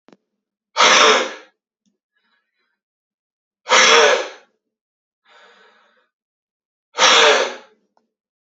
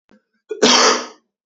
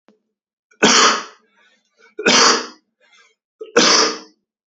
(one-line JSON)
{"exhalation_length": "8.4 s", "exhalation_amplitude": 32767, "exhalation_signal_mean_std_ratio": 0.36, "cough_length": "1.5 s", "cough_amplitude": 29859, "cough_signal_mean_std_ratio": 0.46, "three_cough_length": "4.7 s", "three_cough_amplitude": 32768, "three_cough_signal_mean_std_ratio": 0.42, "survey_phase": "beta (2021-08-13 to 2022-03-07)", "age": "18-44", "gender": "Male", "wearing_mask": "No", "symptom_none": true, "smoker_status": "Never smoked", "respiratory_condition_asthma": false, "respiratory_condition_other": false, "recruitment_source": "REACT", "submission_delay": "2 days", "covid_test_result": "Negative", "covid_test_method": "RT-qPCR", "influenza_a_test_result": "Negative", "influenza_b_test_result": "Negative"}